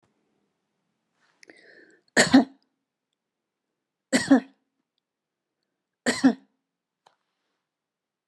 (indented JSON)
{
  "three_cough_length": "8.3 s",
  "three_cough_amplitude": 21420,
  "three_cough_signal_mean_std_ratio": 0.21,
  "survey_phase": "beta (2021-08-13 to 2022-03-07)",
  "age": "65+",
  "gender": "Female",
  "wearing_mask": "No",
  "symptom_none": true,
  "smoker_status": "Never smoked",
  "respiratory_condition_asthma": false,
  "respiratory_condition_other": false,
  "recruitment_source": "REACT",
  "submission_delay": "3 days",
  "covid_test_result": "Negative",
  "covid_test_method": "RT-qPCR"
}